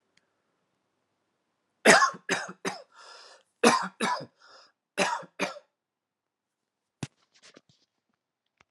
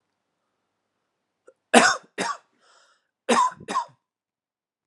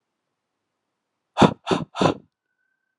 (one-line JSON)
{"three_cough_length": "8.7 s", "three_cough_amplitude": 25192, "three_cough_signal_mean_std_ratio": 0.26, "cough_length": "4.9 s", "cough_amplitude": 32767, "cough_signal_mean_std_ratio": 0.28, "exhalation_length": "3.0 s", "exhalation_amplitude": 31534, "exhalation_signal_mean_std_ratio": 0.26, "survey_phase": "alpha (2021-03-01 to 2021-08-12)", "age": "18-44", "gender": "Male", "wearing_mask": "No", "symptom_none": true, "smoker_status": "Never smoked", "respiratory_condition_asthma": false, "respiratory_condition_other": false, "recruitment_source": "REACT", "submission_delay": "1 day", "covid_test_result": "Negative", "covid_test_method": "RT-qPCR"}